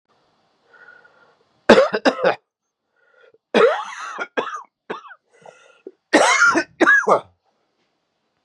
{"three_cough_length": "8.4 s", "three_cough_amplitude": 32768, "three_cough_signal_mean_std_ratio": 0.37, "survey_phase": "beta (2021-08-13 to 2022-03-07)", "age": "45-64", "gender": "Male", "wearing_mask": "No", "symptom_cough_any": true, "symptom_runny_or_blocked_nose": true, "symptom_sore_throat": true, "symptom_abdominal_pain": true, "symptom_fatigue": true, "symptom_headache": true, "symptom_onset": "3 days", "smoker_status": "Never smoked", "respiratory_condition_asthma": false, "respiratory_condition_other": false, "recruitment_source": "Test and Trace", "submission_delay": "2 days", "covid_test_result": "Positive", "covid_test_method": "RT-qPCR", "covid_ct_value": 11.9, "covid_ct_gene": "N gene", "covid_ct_mean": 12.4, "covid_viral_load": "85000000 copies/ml", "covid_viral_load_category": "High viral load (>1M copies/ml)"}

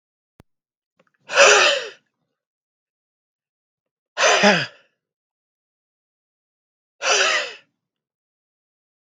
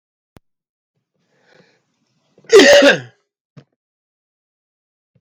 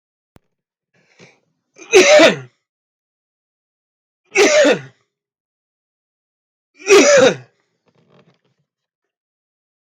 {"exhalation_length": "9.0 s", "exhalation_amplitude": 32766, "exhalation_signal_mean_std_ratio": 0.3, "cough_length": "5.2 s", "cough_amplitude": 32768, "cough_signal_mean_std_ratio": 0.25, "three_cough_length": "9.9 s", "three_cough_amplitude": 32768, "three_cough_signal_mean_std_ratio": 0.31, "survey_phase": "beta (2021-08-13 to 2022-03-07)", "age": "45-64", "gender": "Male", "wearing_mask": "No", "symptom_cough_any": true, "smoker_status": "Never smoked", "respiratory_condition_asthma": false, "respiratory_condition_other": false, "recruitment_source": "REACT", "submission_delay": "1 day", "covid_test_result": "Negative", "covid_test_method": "RT-qPCR", "influenza_a_test_result": "Negative", "influenza_b_test_result": "Negative"}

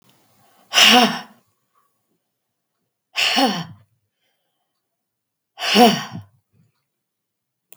{"exhalation_length": "7.8 s", "exhalation_amplitude": 32768, "exhalation_signal_mean_std_ratio": 0.31, "survey_phase": "beta (2021-08-13 to 2022-03-07)", "age": "65+", "gender": "Female", "wearing_mask": "No", "symptom_none": true, "smoker_status": "Ex-smoker", "respiratory_condition_asthma": false, "respiratory_condition_other": false, "recruitment_source": "REACT", "submission_delay": "2 days", "covid_test_result": "Negative", "covid_test_method": "RT-qPCR", "influenza_a_test_result": "Negative", "influenza_b_test_result": "Negative"}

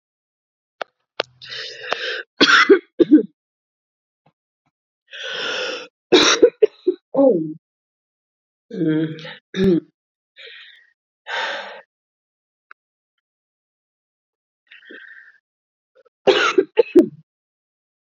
{"three_cough_length": "18.2 s", "three_cough_amplitude": 32768, "three_cough_signal_mean_std_ratio": 0.32, "survey_phase": "beta (2021-08-13 to 2022-03-07)", "age": "18-44", "gender": "Female", "wearing_mask": "No", "symptom_cough_any": true, "symptom_shortness_of_breath": true, "symptom_sore_throat": true, "symptom_fatigue": true, "symptom_change_to_sense_of_smell_or_taste": true, "symptom_onset": "4 days", "smoker_status": "Ex-smoker", "respiratory_condition_asthma": false, "respiratory_condition_other": false, "recruitment_source": "Test and Trace", "submission_delay": "2 days", "covid_test_result": "Positive", "covid_test_method": "ePCR"}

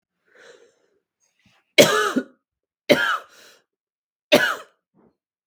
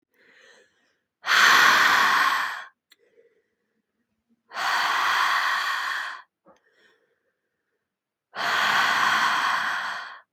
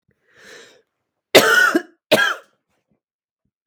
{"three_cough_length": "5.5 s", "three_cough_amplitude": 32768, "three_cough_signal_mean_std_ratio": 0.29, "exhalation_length": "10.3 s", "exhalation_amplitude": 22541, "exhalation_signal_mean_std_ratio": 0.56, "cough_length": "3.7 s", "cough_amplitude": 32768, "cough_signal_mean_std_ratio": 0.34, "survey_phase": "beta (2021-08-13 to 2022-03-07)", "age": "18-44", "gender": "Female", "wearing_mask": "No", "symptom_cough_any": true, "symptom_new_continuous_cough": true, "symptom_runny_or_blocked_nose": true, "symptom_sore_throat": true, "symptom_fatigue": true, "symptom_headache": true, "symptom_onset": "3 days", "smoker_status": "Ex-smoker", "respiratory_condition_asthma": false, "respiratory_condition_other": false, "recruitment_source": "Test and Trace", "submission_delay": "1 day", "covid_test_result": "Positive", "covid_test_method": "RT-qPCR", "covid_ct_value": 19.8, "covid_ct_gene": "ORF1ab gene", "covid_ct_mean": 20.2, "covid_viral_load": "240000 copies/ml", "covid_viral_load_category": "Low viral load (10K-1M copies/ml)"}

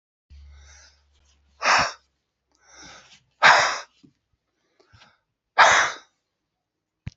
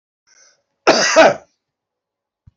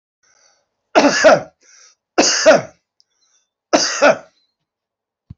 {"exhalation_length": "7.2 s", "exhalation_amplitude": 27852, "exhalation_signal_mean_std_ratio": 0.29, "cough_length": "2.6 s", "cough_amplitude": 28997, "cough_signal_mean_std_ratio": 0.34, "three_cough_length": "5.4 s", "three_cough_amplitude": 29399, "three_cough_signal_mean_std_ratio": 0.38, "survey_phase": "beta (2021-08-13 to 2022-03-07)", "age": "65+", "gender": "Male", "wearing_mask": "No", "symptom_sore_throat": true, "smoker_status": "Never smoked", "respiratory_condition_asthma": false, "respiratory_condition_other": false, "recruitment_source": "Test and Trace", "submission_delay": "1 day", "covid_test_result": "Positive", "covid_test_method": "RT-qPCR", "covid_ct_value": 27.5, "covid_ct_gene": "ORF1ab gene"}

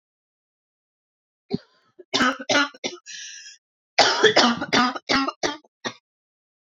{"cough_length": "6.7 s", "cough_amplitude": 29054, "cough_signal_mean_std_ratio": 0.4, "survey_phase": "beta (2021-08-13 to 2022-03-07)", "age": "18-44", "gender": "Female", "wearing_mask": "No", "symptom_cough_any": true, "symptom_runny_or_blocked_nose": true, "symptom_fatigue": true, "symptom_headache": true, "symptom_onset": "3 days", "smoker_status": "Never smoked", "respiratory_condition_asthma": false, "respiratory_condition_other": false, "recruitment_source": "Test and Trace", "submission_delay": "2 days", "covid_test_result": "Positive", "covid_test_method": "RT-qPCR"}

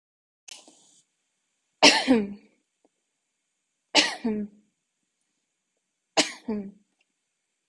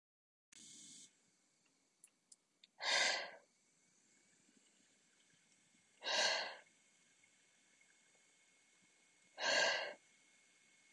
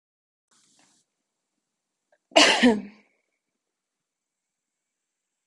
{"three_cough_length": "7.7 s", "three_cough_amplitude": 26433, "three_cough_signal_mean_std_ratio": 0.27, "exhalation_length": "10.9 s", "exhalation_amplitude": 2151, "exhalation_signal_mean_std_ratio": 0.32, "cough_length": "5.5 s", "cough_amplitude": 24865, "cough_signal_mean_std_ratio": 0.21, "survey_phase": "beta (2021-08-13 to 2022-03-07)", "age": "18-44", "gender": "Female", "wearing_mask": "No", "symptom_none": true, "symptom_onset": "3 days", "smoker_status": "Current smoker (e-cigarettes or vapes only)", "respiratory_condition_asthma": false, "respiratory_condition_other": false, "recruitment_source": "Test and Trace", "submission_delay": "1 day", "covid_test_result": "Negative", "covid_test_method": "RT-qPCR"}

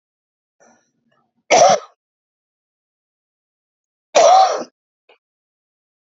{"cough_length": "6.1 s", "cough_amplitude": 31226, "cough_signal_mean_std_ratio": 0.29, "survey_phase": "beta (2021-08-13 to 2022-03-07)", "age": "45-64", "gender": "Female", "wearing_mask": "No", "symptom_cough_any": true, "symptom_fatigue": true, "symptom_headache": true, "symptom_onset": "6 days", "smoker_status": "Current smoker (1 to 10 cigarettes per day)", "respiratory_condition_asthma": false, "respiratory_condition_other": false, "recruitment_source": "Test and Trace", "submission_delay": "2 days", "covid_test_result": "Negative", "covid_test_method": "RT-qPCR"}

